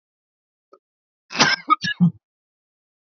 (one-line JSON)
{"cough_length": "3.1 s", "cough_amplitude": 29399, "cough_signal_mean_std_ratio": 0.3, "survey_phase": "beta (2021-08-13 to 2022-03-07)", "age": "18-44", "gender": "Male", "wearing_mask": "No", "symptom_none": true, "smoker_status": "Never smoked", "respiratory_condition_asthma": false, "respiratory_condition_other": false, "recruitment_source": "REACT", "submission_delay": "1 day", "covid_test_result": "Negative", "covid_test_method": "RT-qPCR", "influenza_a_test_result": "Negative", "influenza_b_test_result": "Negative"}